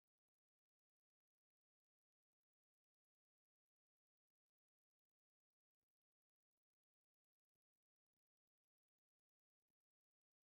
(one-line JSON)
{"exhalation_length": "10.5 s", "exhalation_amplitude": 2, "exhalation_signal_mean_std_ratio": 0.06, "survey_phase": "beta (2021-08-13 to 2022-03-07)", "age": "65+", "gender": "Female", "wearing_mask": "No", "symptom_none": true, "smoker_status": "Ex-smoker", "respiratory_condition_asthma": false, "respiratory_condition_other": false, "recruitment_source": "REACT", "submission_delay": "2 days", "covid_test_result": "Negative", "covid_test_method": "RT-qPCR", "influenza_a_test_result": "Negative", "influenza_b_test_result": "Negative"}